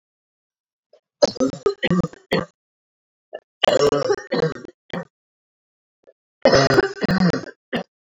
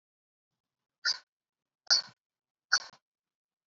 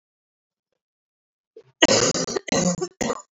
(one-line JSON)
{"three_cough_length": "8.2 s", "three_cough_amplitude": 28416, "three_cough_signal_mean_std_ratio": 0.41, "exhalation_length": "3.7 s", "exhalation_amplitude": 9920, "exhalation_signal_mean_std_ratio": 0.21, "cough_length": "3.3 s", "cough_amplitude": 28196, "cough_signal_mean_std_ratio": 0.4, "survey_phase": "beta (2021-08-13 to 2022-03-07)", "age": "18-44", "gender": "Female", "wearing_mask": "No", "symptom_cough_any": true, "symptom_runny_or_blocked_nose": true, "symptom_fatigue": true, "symptom_headache": true, "symptom_change_to_sense_of_smell_or_taste": true, "symptom_loss_of_taste": true, "smoker_status": "Never smoked", "respiratory_condition_asthma": false, "respiratory_condition_other": false, "recruitment_source": "Test and Trace", "submission_delay": "2 days", "covid_test_result": "Positive", "covid_test_method": "ePCR"}